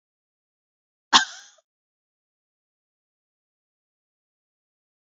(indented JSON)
{
  "cough_length": "5.1 s",
  "cough_amplitude": 32767,
  "cough_signal_mean_std_ratio": 0.11,
  "survey_phase": "beta (2021-08-13 to 2022-03-07)",
  "age": "45-64",
  "gender": "Female",
  "wearing_mask": "No",
  "symptom_none": true,
  "smoker_status": "Never smoked",
  "respiratory_condition_asthma": false,
  "respiratory_condition_other": false,
  "recruitment_source": "REACT",
  "submission_delay": "2 days",
  "covid_test_result": "Negative",
  "covid_test_method": "RT-qPCR"
}